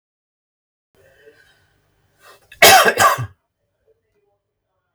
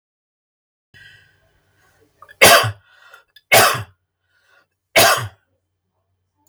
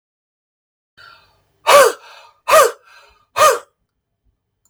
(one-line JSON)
{"cough_length": "4.9 s", "cough_amplitude": 32768, "cough_signal_mean_std_ratio": 0.27, "three_cough_length": "6.5 s", "three_cough_amplitude": 32768, "three_cough_signal_mean_std_ratio": 0.29, "exhalation_length": "4.7 s", "exhalation_amplitude": 32768, "exhalation_signal_mean_std_ratio": 0.31, "survey_phase": "beta (2021-08-13 to 2022-03-07)", "age": "65+", "gender": "Male", "wearing_mask": "No", "symptom_none": true, "smoker_status": "Never smoked", "respiratory_condition_asthma": false, "respiratory_condition_other": false, "recruitment_source": "REACT", "submission_delay": "3 days", "covid_test_result": "Negative", "covid_test_method": "RT-qPCR", "influenza_a_test_result": "Negative", "influenza_b_test_result": "Negative"}